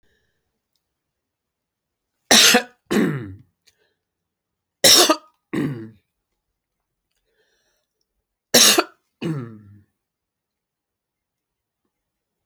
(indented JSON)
{
  "three_cough_length": "12.5 s",
  "three_cough_amplitude": 32768,
  "three_cough_signal_mean_std_ratio": 0.27,
  "survey_phase": "beta (2021-08-13 to 2022-03-07)",
  "age": "65+",
  "gender": "Male",
  "wearing_mask": "No",
  "symptom_none": true,
  "smoker_status": "Never smoked",
  "respiratory_condition_asthma": false,
  "respiratory_condition_other": false,
  "recruitment_source": "REACT",
  "submission_delay": "1 day",
  "covid_test_result": "Negative",
  "covid_test_method": "RT-qPCR"
}